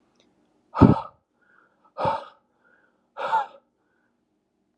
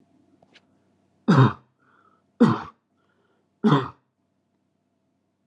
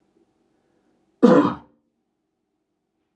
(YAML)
exhalation_length: 4.8 s
exhalation_amplitude: 31847
exhalation_signal_mean_std_ratio: 0.25
three_cough_length: 5.5 s
three_cough_amplitude: 20944
three_cough_signal_mean_std_ratio: 0.27
cough_length: 3.2 s
cough_amplitude: 28911
cough_signal_mean_std_ratio: 0.24
survey_phase: beta (2021-08-13 to 2022-03-07)
age: 18-44
gender: Male
wearing_mask: 'No'
symptom_sore_throat: true
symptom_onset: 11 days
smoker_status: Never smoked
respiratory_condition_asthma: false
respiratory_condition_other: false
recruitment_source: REACT
submission_delay: 0 days
covid_test_result: Negative
covid_test_method: RT-qPCR
influenza_a_test_result: Negative
influenza_b_test_result: Negative